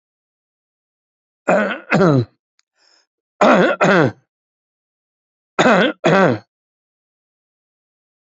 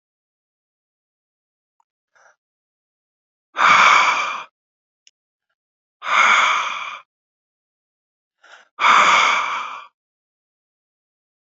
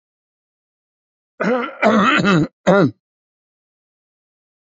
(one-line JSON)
{"three_cough_length": "8.3 s", "three_cough_amplitude": 32767, "three_cough_signal_mean_std_ratio": 0.38, "exhalation_length": "11.4 s", "exhalation_amplitude": 28995, "exhalation_signal_mean_std_ratio": 0.36, "cough_length": "4.8 s", "cough_amplitude": 27787, "cough_signal_mean_std_ratio": 0.39, "survey_phase": "alpha (2021-03-01 to 2021-08-12)", "age": "65+", "gender": "Male", "wearing_mask": "No", "symptom_headache": true, "smoker_status": "Ex-smoker", "respiratory_condition_asthma": false, "respiratory_condition_other": false, "recruitment_source": "Test and Trace", "submission_delay": "2 days", "covid_test_result": "Positive", "covid_test_method": "RT-qPCR"}